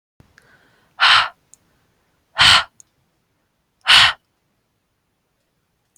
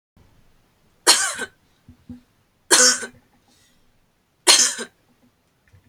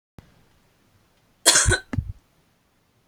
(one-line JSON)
{"exhalation_length": "6.0 s", "exhalation_amplitude": 32768, "exhalation_signal_mean_std_ratio": 0.29, "three_cough_length": "5.9 s", "three_cough_amplitude": 32768, "three_cough_signal_mean_std_ratio": 0.3, "cough_length": "3.1 s", "cough_amplitude": 31657, "cough_signal_mean_std_ratio": 0.29, "survey_phase": "beta (2021-08-13 to 2022-03-07)", "age": "18-44", "gender": "Female", "wearing_mask": "No", "symptom_none": true, "smoker_status": "Never smoked", "respiratory_condition_asthma": false, "respiratory_condition_other": false, "recruitment_source": "REACT", "submission_delay": "0 days", "covid_test_result": "Negative", "covid_test_method": "RT-qPCR"}